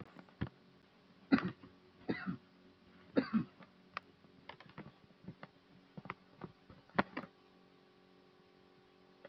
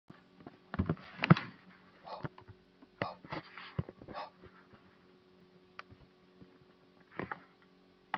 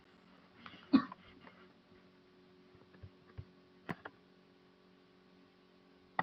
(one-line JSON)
{"three_cough_length": "9.3 s", "three_cough_amplitude": 6699, "three_cough_signal_mean_std_ratio": 0.28, "exhalation_length": "8.2 s", "exhalation_amplitude": 13154, "exhalation_signal_mean_std_ratio": 0.24, "cough_length": "6.2 s", "cough_amplitude": 5875, "cough_signal_mean_std_ratio": 0.2, "survey_phase": "beta (2021-08-13 to 2022-03-07)", "age": "45-64", "gender": "Male", "wearing_mask": "No", "symptom_none": true, "smoker_status": "Never smoked", "respiratory_condition_asthma": false, "respiratory_condition_other": false, "recruitment_source": "REACT", "submission_delay": "9 days", "covid_test_result": "Negative", "covid_test_method": "RT-qPCR"}